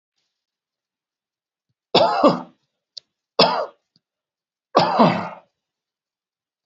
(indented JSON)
{
  "three_cough_length": "6.7 s",
  "three_cough_amplitude": 30125,
  "three_cough_signal_mean_std_ratio": 0.32,
  "survey_phase": "alpha (2021-03-01 to 2021-08-12)",
  "age": "45-64",
  "gender": "Male",
  "wearing_mask": "No",
  "symptom_none": true,
  "smoker_status": "Never smoked",
  "respiratory_condition_asthma": false,
  "respiratory_condition_other": false,
  "recruitment_source": "REACT",
  "submission_delay": "2 days",
  "covid_test_result": "Negative",
  "covid_test_method": "RT-qPCR"
}